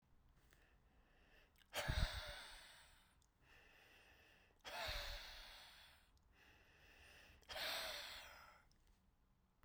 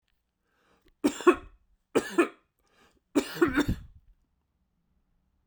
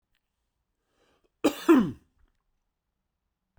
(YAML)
exhalation_length: 9.6 s
exhalation_amplitude: 1690
exhalation_signal_mean_std_ratio: 0.45
three_cough_length: 5.5 s
three_cough_amplitude: 14757
three_cough_signal_mean_std_ratio: 0.29
cough_length: 3.6 s
cough_amplitude: 13377
cough_signal_mean_std_ratio: 0.23
survey_phase: beta (2021-08-13 to 2022-03-07)
age: 65+
gender: Male
wearing_mask: 'No'
symptom_none: true
symptom_onset: 12 days
smoker_status: Never smoked
respiratory_condition_asthma: true
respiratory_condition_other: false
recruitment_source: REACT
submission_delay: 2 days
covid_test_result: Negative
covid_test_method: RT-qPCR